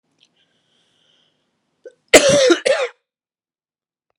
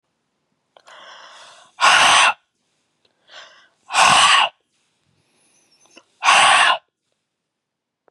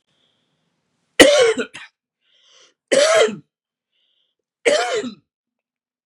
{
  "cough_length": "4.2 s",
  "cough_amplitude": 32768,
  "cough_signal_mean_std_ratio": 0.3,
  "exhalation_length": "8.1 s",
  "exhalation_amplitude": 31085,
  "exhalation_signal_mean_std_ratio": 0.38,
  "three_cough_length": "6.1 s",
  "three_cough_amplitude": 32768,
  "three_cough_signal_mean_std_ratio": 0.35,
  "survey_phase": "beta (2021-08-13 to 2022-03-07)",
  "age": "45-64",
  "gender": "Male",
  "wearing_mask": "No",
  "symptom_cough_any": true,
  "symptom_new_continuous_cough": true,
  "symptom_runny_or_blocked_nose": true,
  "symptom_sore_throat": true,
  "symptom_fatigue": true,
  "symptom_fever_high_temperature": true,
  "symptom_headache": true,
  "symptom_onset": "4 days",
  "smoker_status": "Never smoked",
  "respiratory_condition_asthma": false,
  "respiratory_condition_other": false,
  "recruitment_source": "Test and Trace",
  "submission_delay": "1 day",
  "covid_test_result": "Positive",
  "covid_test_method": "RT-qPCR",
  "covid_ct_value": 23.0,
  "covid_ct_gene": "ORF1ab gene",
  "covid_ct_mean": 23.5,
  "covid_viral_load": "19000 copies/ml",
  "covid_viral_load_category": "Low viral load (10K-1M copies/ml)"
}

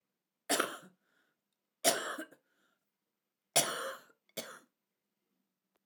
{
  "three_cough_length": "5.9 s",
  "three_cough_amplitude": 8075,
  "three_cough_signal_mean_std_ratio": 0.29,
  "survey_phase": "alpha (2021-03-01 to 2021-08-12)",
  "age": "65+",
  "gender": "Female",
  "wearing_mask": "No",
  "symptom_cough_any": true,
  "smoker_status": "Ex-smoker",
  "respiratory_condition_asthma": true,
  "respiratory_condition_other": true,
  "recruitment_source": "REACT",
  "submission_delay": "1 day",
  "covid_test_result": "Negative",
  "covid_test_method": "RT-qPCR"
}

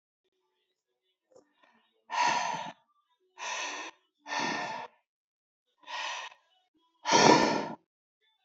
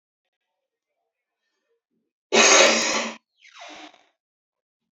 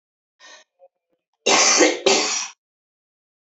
{
  "exhalation_length": "8.4 s",
  "exhalation_amplitude": 18828,
  "exhalation_signal_mean_std_ratio": 0.36,
  "cough_length": "4.9 s",
  "cough_amplitude": 25970,
  "cough_signal_mean_std_ratio": 0.3,
  "three_cough_length": "3.4 s",
  "three_cough_amplitude": 25226,
  "three_cough_signal_mean_std_ratio": 0.42,
  "survey_phase": "beta (2021-08-13 to 2022-03-07)",
  "age": "18-44",
  "gender": "Female",
  "wearing_mask": "No",
  "symptom_none": true,
  "smoker_status": "Current smoker (1 to 10 cigarettes per day)",
  "respiratory_condition_asthma": true,
  "respiratory_condition_other": true,
  "recruitment_source": "REACT",
  "submission_delay": "1 day",
  "covid_test_result": "Negative",
  "covid_test_method": "RT-qPCR"
}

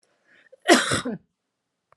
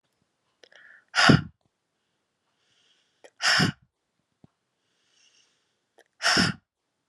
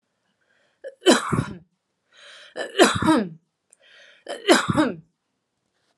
{
  "cough_length": "2.0 s",
  "cough_amplitude": 31165,
  "cough_signal_mean_std_ratio": 0.32,
  "exhalation_length": "7.1 s",
  "exhalation_amplitude": 23719,
  "exhalation_signal_mean_std_ratio": 0.27,
  "three_cough_length": "6.0 s",
  "three_cough_amplitude": 29438,
  "three_cough_signal_mean_std_ratio": 0.37,
  "survey_phase": "alpha (2021-03-01 to 2021-08-12)",
  "age": "18-44",
  "gender": "Female",
  "wearing_mask": "No",
  "symptom_cough_any": true,
  "symptom_shortness_of_breath": true,
  "symptom_fatigue": true,
  "symptom_headache": true,
  "symptom_change_to_sense_of_smell_or_taste": true,
  "smoker_status": "Never smoked",
  "respiratory_condition_asthma": false,
  "respiratory_condition_other": false,
  "recruitment_source": "Test and Trace",
  "submission_delay": "4 days",
  "covid_test_result": "Positive",
  "covid_test_method": "RT-qPCR",
  "covid_ct_value": 25.7,
  "covid_ct_gene": "ORF1ab gene",
  "covid_ct_mean": 26.4,
  "covid_viral_load": "2100 copies/ml",
  "covid_viral_load_category": "Minimal viral load (< 10K copies/ml)"
}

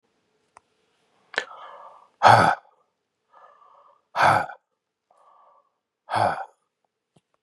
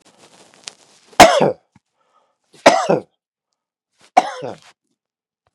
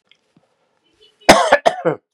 {
  "exhalation_length": "7.4 s",
  "exhalation_amplitude": 32575,
  "exhalation_signal_mean_std_ratio": 0.27,
  "three_cough_length": "5.5 s",
  "three_cough_amplitude": 32768,
  "three_cough_signal_mean_std_ratio": 0.26,
  "cough_length": "2.1 s",
  "cough_amplitude": 32768,
  "cough_signal_mean_std_ratio": 0.33,
  "survey_phase": "beta (2021-08-13 to 2022-03-07)",
  "age": "45-64",
  "gender": "Male",
  "wearing_mask": "No",
  "symptom_none": true,
  "symptom_onset": "6 days",
  "smoker_status": "Ex-smoker",
  "respiratory_condition_asthma": false,
  "respiratory_condition_other": false,
  "recruitment_source": "REACT",
  "submission_delay": "1 day",
  "covid_test_result": "Negative",
  "covid_test_method": "RT-qPCR"
}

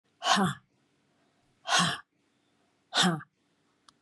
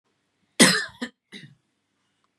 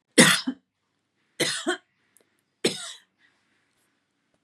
{
  "exhalation_length": "4.0 s",
  "exhalation_amplitude": 11689,
  "exhalation_signal_mean_std_ratio": 0.37,
  "cough_length": "2.4 s",
  "cough_amplitude": 31639,
  "cough_signal_mean_std_ratio": 0.25,
  "three_cough_length": "4.4 s",
  "three_cough_amplitude": 30398,
  "three_cough_signal_mean_std_ratio": 0.27,
  "survey_phase": "beta (2021-08-13 to 2022-03-07)",
  "age": "45-64",
  "gender": "Female",
  "wearing_mask": "No",
  "symptom_shortness_of_breath": true,
  "smoker_status": "Never smoked",
  "respiratory_condition_asthma": false,
  "respiratory_condition_other": false,
  "recruitment_source": "REACT",
  "submission_delay": "3 days",
  "covid_test_result": "Negative",
  "covid_test_method": "RT-qPCR",
  "influenza_a_test_result": "Negative",
  "influenza_b_test_result": "Negative"
}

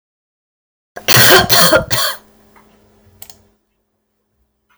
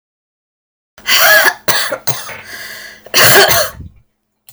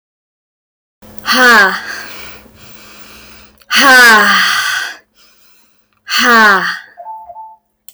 {
  "three_cough_length": "4.8 s",
  "three_cough_amplitude": 32768,
  "three_cough_signal_mean_std_ratio": 0.37,
  "cough_length": "4.5 s",
  "cough_amplitude": 32768,
  "cough_signal_mean_std_ratio": 0.51,
  "exhalation_length": "7.9 s",
  "exhalation_amplitude": 32768,
  "exhalation_signal_mean_std_ratio": 0.52,
  "survey_phase": "alpha (2021-03-01 to 2021-08-12)",
  "age": "18-44",
  "gender": "Female",
  "wearing_mask": "No",
  "symptom_none": true,
  "smoker_status": "Ex-smoker",
  "respiratory_condition_asthma": false,
  "respiratory_condition_other": false,
  "recruitment_source": "REACT",
  "submission_delay": "3 days",
  "covid_test_result": "Negative",
  "covid_test_method": "RT-qPCR"
}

